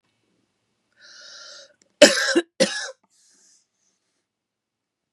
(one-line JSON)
{"cough_length": "5.1 s", "cough_amplitude": 32768, "cough_signal_mean_std_ratio": 0.23, "survey_phase": "beta (2021-08-13 to 2022-03-07)", "age": "45-64", "gender": "Female", "wearing_mask": "No", "symptom_runny_or_blocked_nose": true, "symptom_fatigue": true, "symptom_other": true, "symptom_onset": "3 days", "smoker_status": "Ex-smoker", "respiratory_condition_asthma": false, "respiratory_condition_other": false, "recruitment_source": "Test and Trace", "submission_delay": "2 days", "covid_test_result": "Positive", "covid_test_method": "RT-qPCR", "covid_ct_value": 21.3, "covid_ct_gene": "N gene", "covid_ct_mean": 21.6, "covid_viral_load": "80000 copies/ml", "covid_viral_load_category": "Low viral load (10K-1M copies/ml)"}